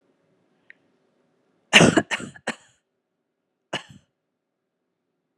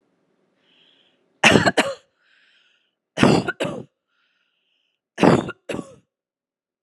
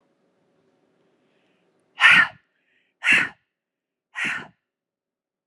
cough_length: 5.4 s
cough_amplitude: 32411
cough_signal_mean_std_ratio: 0.2
three_cough_length: 6.8 s
three_cough_amplitude: 32768
three_cough_signal_mean_std_ratio: 0.3
exhalation_length: 5.5 s
exhalation_amplitude: 27502
exhalation_signal_mean_std_ratio: 0.26
survey_phase: beta (2021-08-13 to 2022-03-07)
age: 18-44
gender: Female
wearing_mask: 'No'
symptom_none: true
smoker_status: Never smoked
respiratory_condition_asthma: true
respiratory_condition_other: false
recruitment_source: Test and Trace
submission_delay: 1 day
covid_test_result: Negative
covid_test_method: RT-qPCR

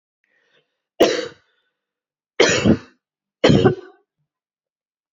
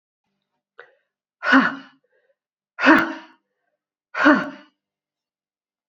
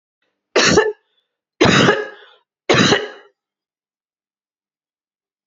cough_length: 5.1 s
cough_amplitude: 32369
cough_signal_mean_std_ratio: 0.33
exhalation_length: 5.9 s
exhalation_amplitude: 32193
exhalation_signal_mean_std_ratio: 0.29
three_cough_length: 5.5 s
three_cough_amplitude: 29365
three_cough_signal_mean_std_ratio: 0.38
survey_phase: beta (2021-08-13 to 2022-03-07)
age: 45-64
gender: Female
wearing_mask: 'No'
symptom_fatigue: true
symptom_onset: 9 days
smoker_status: Never smoked
respiratory_condition_asthma: false
respiratory_condition_other: false
recruitment_source: REACT
submission_delay: 0 days
covid_test_result: Negative
covid_test_method: RT-qPCR
influenza_a_test_result: Negative
influenza_b_test_result: Negative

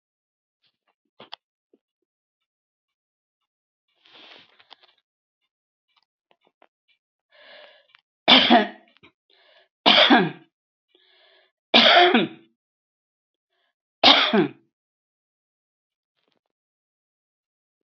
cough_length: 17.8 s
cough_amplitude: 32018
cough_signal_mean_std_ratio: 0.24
survey_phase: alpha (2021-03-01 to 2021-08-12)
age: 65+
gender: Female
wearing_mask: 'No'
symptom_none: true
smoker_status: Never smoked
respiratory_condition_asthma: false
respiratory_condition_other: false
recruitment_source: REACT
submission_delay: 1 day
covid_test_result: Negative
covid_test_method: RT-qPCR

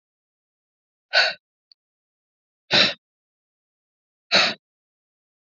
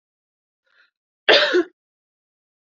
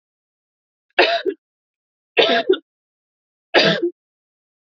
exhalation_length: 5.5 s
exhalation_amplitude: 21211
exhalation_signal_mean_std_ratio: 0.26
cough_length: 2.7 s
cough_amplitude: 27553
cough_signal_mean_std_ratio: 0.27
three_cough_length: 4.8 s
three_cough_amplitude: 29285
three_cough_signal_mean_std_ratio: 0.35
survey_phase: beta (2021-08-13 to 2022-03-07)
age: 18-44
gender: Female
wearing_mask: 'No'
symptom_runny_or_blocked_nose: true
symptom_fatigue: true
symptom_headache: true
smoker_status: Never smoked
respiratory_condition_asthma: false
respiratory_condition_other: false
recruitment_source: Test and Trace
submission_delay: 1 day
covid_test_result: Positive
covid_test_method: RT-qPCR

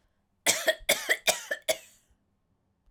cough_length: 2.9 s
cough_amplitude: 15003
cough_signal_mean_std_ratio: 0.37
survey_phase: alpha (2021-03-01 to 2021-08-12)
age: 45-64
gender: Female
wearing_mask: 'No'
symptom_fatigue: true
smoker_status: Ex-smoker
respiratory_condition_asthma: false
respiratory_condition_other: false
recruitment_source: Test and Trace
submission_delay: 2 days
covid_test_result: Positive
covid_test_method: RT-qPCR
covid_ct_value: 15.6
covid_ct_gene: ORF1ab gene
covid_ct_mean: 16.3
covid_viral_load: 4500000 copies/ml
covid_viral_load_category: High viral load (>1M copies/ml)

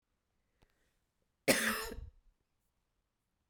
cough_length: 3.5 s
cough_amplitude: 8373
cough_signal_mean_std_ratio: 0.27
survey_phase: beta (2021-08-13 to 2022-03-07)
age: 45-64
gender: Female
wearing_mask: 'No'
symptom_cough_any: true
symptom_runny_or_blocked_nose: true
symptom_fatigue: true
symptom_change_to_sense_of_smell_or_taste: true
symptom_loss_of_taste: true
symptom_onset: 8 days
smoker_status: Never smoked
respiratory_condition_asthma: false
respiratory_condition_other: false
recruitment_source: Test and Trace
submission_delay: 2 days
covid_test_result: Positive
covid_test_method: LAMP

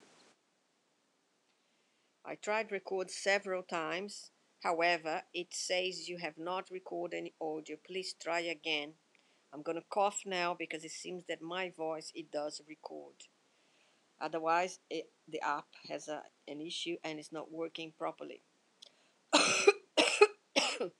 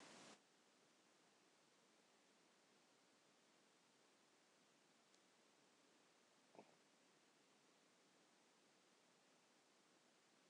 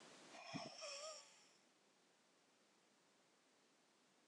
three_cough_length: 21.0 s
three_cough_amplitude: 12048
three_cough_signal_mean_std_ratio: 0.47
cough_length: 10.5 s
cough_amplitude: 147
cough_signal_mean_std_ratio: 0.88
exhalation_length: 4.3 s
exhalation_amplitude: 478
exhalation_signal_mean_std_ratio: 0.52
survey_phase: beta (2021-08-13 to 2022-03-07)
age: 45-64
gender: Female
wearing_mask: 'No'
symptom_cough_any: true
symptom_abdominal_pain: true
symptom_diarrhoea: true
symptom_headache: true
smoker_status: Ex-smoker
respiratory_condition_asthma: true
respiratory_condition_other: false
recruitment_source: Test and Trace
submission_delay: 3 days
covid_test_result: Positive
covid_test_method: RT-qPCR
covid_ct_value: 35.4
covid_ct_gene: N gene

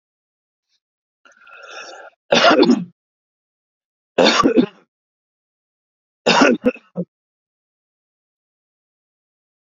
three_cough_length: 9.7 s
three_cough_amplitude: 30605
three_cough_signal_mean_std_ratio: 0.3
survey_phase: beta (2021-08-13 to 2022-03-07)
age: 18-44
gender: Male
wearing_mask: 'No'
symptom_none: true
smoker_status: Never smoked
respiratory_condition_asthma: false
respiratory_condition_other: false
recruitment_source: REACT
submission_delay: 38 days
covid_test_result: Negative
covid_test_method: RT-qPCR
influenza_a_test_result: Negative
influenza_b_test_result: Negative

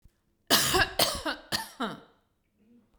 cough_length: 3.0 s
cough_amplitude: 16106
cough_signal_mean_std_ratio: 0.44
survey_phase: beta (2021-08-13 to 2022-03-07)
age: 45-64
gender: Female
wearing_mask: 'No'
symptom_none: true
smoker_status: Never smoked
respiratory_condition_asthma: false
respiratory_condition_other: false
recruitment_source: REACT
submission_delay: 1 day
covid_test_result: Negative
covid_test_method: RT-qPCR
influenza_a_test_result: Negative
influenza_b_test_result: Negative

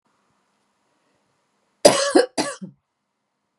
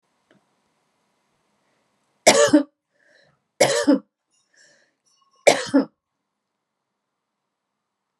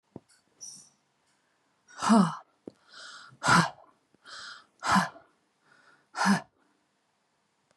cough_length: 3.6 s
cough_amplitude: 32768
cough_signal_mean_std_ratio: 0.25
three_cough_length: 8.2 s
three_cough_amplitude: 32345
three_cough_signal_mean_std_ratio: 0.25
exhalation_length: 7.8 s
exhalation_amplitude: 12642
exhalation_signal_mean_std_ratio: 0.31
survey_phase: beta (2021-08-13 to 2022-03-07)
age: 45-64
gender: Female
wearing_mask: 'No'
symptom_fatigue: true
symptom_onset: 12 days
smoker_status: Ex-smoker
respiratory_condition_asthma: false
respiratory_condition_other: false
recruitment_source: REACT
submission_delay: 0 days
covid_test_result: Negative
covid_test_method: RT-qPCR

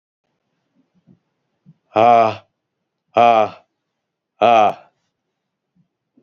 exhalation_length: 6.2 s
exhalation_amplitude: 29285
exhalation_signal_mean_std_ratio: 0.32
survey_phase: beta (2021-08-13 to 2022-03-07)
age: 45-64
gender: Male
wearing_mask: 'No'
symptom_cough_any: true
symptom_runny_or_blocked_nose: true
symptom_shortness_of_breath: true
symptom_sore_throat: true
symptom_fatigue: true
symptom_onset: 5 days
smoker_status: Never smoked
respiratory_condition_asthma: false
respiratory_condition_other: false
recruitment_source: Test and Trace
submission_delay: 2 days
covid_test_result: Positive
covid_test_method: ePCR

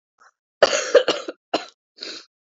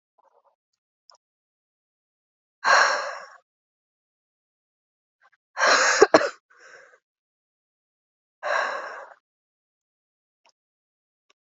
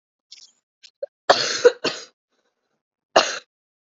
cough_length: 2.6 s
cough_amplitude: 28941
cough_signal_mean_std_ratio: 0.32
exhalation_length: 11.4 s
exhalation_amplitude: 32768
exhalation_signal_mean_std_ratio: 0.26
three_cough_length: 3.9 s
three_cough_amplitude: 32767
three_cough_signal_mean_std_ratio: 0.27
survey_phase: alpha (2021-03-01 to 2021-08-12)
age: 18-44
gender: Female
wearing_mask: 'No'
symptom_cough_any: true
symptom_fatigue: true
symptom_fever_high_temperature: true
symptom_headache: true
symptom_onset: 4 days
smoker_status: Never smoked
respiratory_condition_asthma: false
respiratory_condition_other: false
recruitment_source: Test and Trace
submission_delay: 2 days
covid_test_result: Positive
covid_test_method: RT-qPCR
covid_ct_value: 13.0
covid_ct_gene: ORF1ab gene
covid_ct_mean: 13.5
covid_viral_load: 36000000 copies/ml
covid_viral_load_category: High viral load (>1M copies/ml)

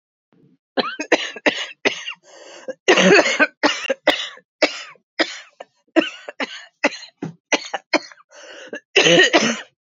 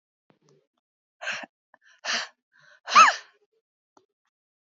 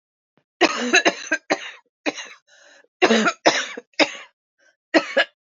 cough_length: 10.0 s
cough_amplitude: 28463
cough_signal_mean_std_ratio: 0.42
exhalation_length: 4.7 s
exhalation_amplitude: 22744
exhalation_signal_mean_std_ratio: 0.22
three_cough_length: 5.5 s
three_cough_amplitude: 28877
three_cough_signal_mean_std_ratio: 0.4
survey_phase: beta (2021-08-13 to 2022-03-07)
age: 45-64
gender: Female
wearing_mask: 'No'
symptom_cough_any: true
symptom_shortness_of_breath: true
symptom_onset: 11 days
smoker_status: Ex-smoker
respiratory_condition_asthma: false
respiratory_condition_other: false
recruitment_source: REACT
submission_delay: 4 days
covid_test_result: Positive
covid_test_method: RT-qPCR
covid_ct_value: 30.0
covid_ct_gene: N gene
influenza_a_test_result: Negative
influenza_b_test_result: Negative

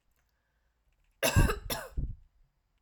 cough_length: 2.8 s
cough_amplitude: 8017
cough_signal_mean_std_ratio: 0.35
survey_phase: alpha (2021-03-01 to 2021-08-12)
age: 18-44
gender: Female
wearing_mask: 'No'
symptom_none: true
smoker_status: Ex-smoker
respiratory_condition_asthma: false
respiratory_condition_other: false
recruitment_source: REACT
submission_delay: 1 day
covid_test_result: Negative
covid_test_method: RT-qPCR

